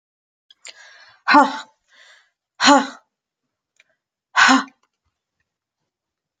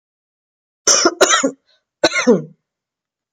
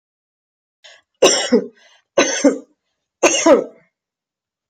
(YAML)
exhalation_length: 6.4 s
exhalation_amplitude: 31856
exhalation_signal_mean_std_ratio: 0.28
cough_length: 3.3 s
cough_amplitude: 32490
cough_signal_mean_std_ratio: 0.4
three_cough_length: 4.7 s
three_cough_amplitude: 28833
three_cough_signal_mean_std_ratio: 0.37
survey_phase: beta (2021-08-13 to 2022-03-07)
age: 45-64
gender: Female
wearing_mask: 'No'
symptom_none: true
symptom_onset: 12 days
smoker_status: Ex-smoker
respiratory_condition_asthma: false
respiratory_condition_other: false
recruitment_source: REACT
submission_delay: 1 day
covid_test_result: Negative
covid_test_method: RT-qPCR
covid_ct_value: 43.0
covid_ct_gene: N gene